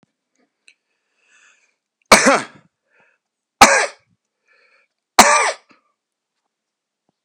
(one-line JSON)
{"three_cough_length": "7.2 s", "three_cough_amplitude": 32768, "three_cough_signal_mean_std_ratio": 0.25, "survey_phase": "beta (2021-08-13 to 2022-03-07)", "age": "65+", "gender": "Male", "wearing_mask": "No", "symptom_none": true, "smoker_status": "Never smoked", "respiratory_condition_asthma": false, "respiratory_condition_other": false, "recruitment_source": "REACT", "submission_delay": "2 days", "covid_test_result": "Negative", "covid_test_method": "RT-qPCR"}